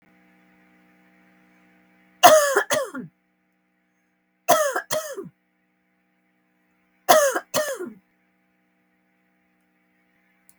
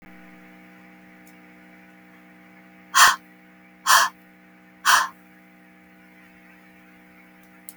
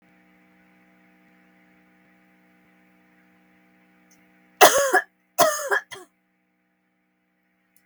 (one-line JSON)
{"three_cough_length": "10.6 s", "three_cough_amplitude": 32768, "three_cough_signal_mean_std_ratio": 0.28, "exhalation_length": "7.8 s", "exhalation_amplitude": 32058, "exhalation_signal_mean_std_ratio": 0.27, "cough_length": "7.9 s", "cough_amplitude": 32768, "cough_signal_mean_std_ratio": 0.23, "survey_phase": "beta (2021-08-13 to 2022-03-07)", "age": "65+", "gender": "Female", "wearing_mask": "No", "symptom_none": true, "smoker_status": "Never smoked", "respiratory_condition_asthma": false, "respiratory_condition_other": false, "recruitment_source": "REACT", "submission_delay": "0 days", "covid_test_result": "Negative", "covid_test_method": "RT-qPCR"}